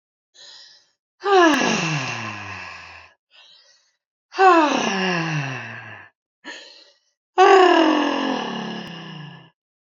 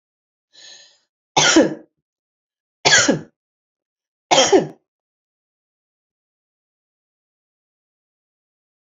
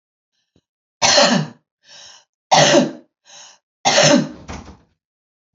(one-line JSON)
{"exhalation_length": "9.9 s", "exhalation_amplitude": 26855, "exhalation_signal_mean_std_ratio": 0.48, "cough_length": "9.0 s", "cough_amplitude": 32767, "cough_signal_mean_std_ratio": 0.26, "three_cough_length": "5.5 s", "three_cough_amplitude": 31266, "three_cough_signal_mean_std_ratio": 0.4, "survey_phase": "beta (2021-08-13 to 2022-03-07)", "age": "18-44", "gender": "Female", "wearing_mask": "No", "symptom_none": true, "symptom_onset": "12 days", "smoker_status": "Current smoker (1 to 10 cigarettes per day)", "respiratory_condition_asthma": false, "respiratory_condition_other": false, "recruitment_source": "REACT", "submission_delay": "3 days", "covid_test_result": "Negative", "covid_test_method": "RT-qPCR", "influenza_a_test_result": "Negative", "influenza_b_test_result": "Negative"}